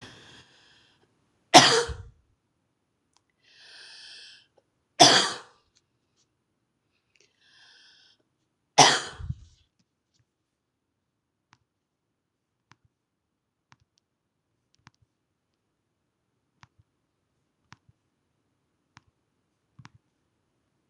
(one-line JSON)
{"three_cough_length": "20.9 s", "three_cough_amplitude": 26028, "three_cough_signal_mean_std_ratio": 0.16, "survey_phase": "beta (2021-08-13 to 2022-03-07)", "age": "65+", "gender": "Female", "wearing_mask": "No", "symptom_runny_or_blocked_nose": true, "symptom_fatigue": true, "smoker_status": "Ex-smoker", "respiratory_condition_asthma": false, "respiratory_condition_other": true, "recruitment_source": "REACT", "submission_delay": "1 day", "covid_test_result": "Negative", "covid_test_method": "RT-qPCR"}